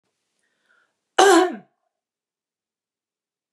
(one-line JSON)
{"cough_length": "3.5 s", "cough_amplitude": 32767, "cough_signal_mean_std_ratio": 0.24, "survey_phase": "beta (2021-08-13 to 2022-03-07)", "age": "45-64", "gender": "Female", "wearing_mask": "No", "symptom_none": true, "smoker_status": "Never smoked", "respiratory_condition_asthma": false, "respiratory_condition_other": false, "recruitment_source": "Test and Trace", "submission_delay": "-1 day", "covid_test_result": "Negative", "covid_test_method": "LFT"}